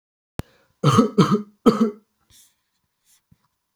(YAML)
three_cough_length: 3.8 s
three_cough_amplitude: 28883
three_cough_signal_mean_std_ratio: 0.33
survey_phase: beta (2021-08-13 to 2022-03-07)
age: 45-64
gender: Male
wearing_mask: 'No'
symptom_none: true
symptom_onset: 4 days
smoker_status: Never smoked
respiratory_condition_asthma: false
respiratory_condition_other: false
recruitment_source: REACT
submission_delay: 1 day
covid_test_result: Negative
covid_test_method: RT-qPCR
influenza_a_test_result: Negative
influenza_b_test_result: Negative